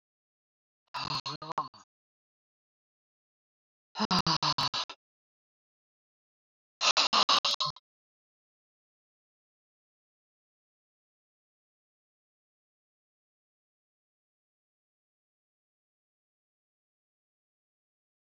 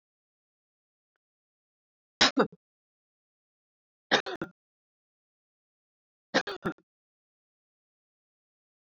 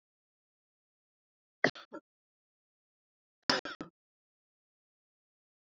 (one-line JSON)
{"exhalation_length": "18.3 s", "exhalation_amplitude": 9234, "exhalation_signal_mean_std_ratio": 0.22, "three_cough_length": "9.0 s", "three_cough_amplitude": 13772, "three_cough_signal_mean_std_ratio": 0.17, "cough_length": "5.6 s", "cough_amplitude": 10658, "cough_signal_mean_std_ratio": 0.14, "survey_phase": "alpha (2021-03-01 to 2021-08-12)", "age": "65+", "gender": "Female", "wearing_mask": "No", "symptom_none": true, "smoker_status": "Ex-smoker", "respiratory_condition_asthma": false, "respiratory_condition_other": false, "recruitment_source": "REACT", "submission_delay": "1 day", "covid_test_result": "Negative", "covid_test_method": "RT-qPCR"}